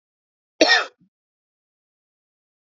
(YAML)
cough_length: 2.6 s
cough_amplitude: 27068
cough_signal_mean_std_ratio: 0.22
survey_phase: beta (2021-08-13 to 2022-03-07)
age: 45-64
gender: Male
wearing_mask: 'No'
symptom_cough_any: true
symptom_new_continuous_cough: true
symptom_runny_or_blocked_nose: true
symptom_change_to_sense_of_smell_or_taste: true
symptom_onset: 4 days
smoker_status: Never smoked
respiratory_condition_asthma: false
respiratory_condition_other: false
recruitment_source: Test and Trace
submission_delay: 2 days
covid_test_result: Positive
covid_test_method: ePCR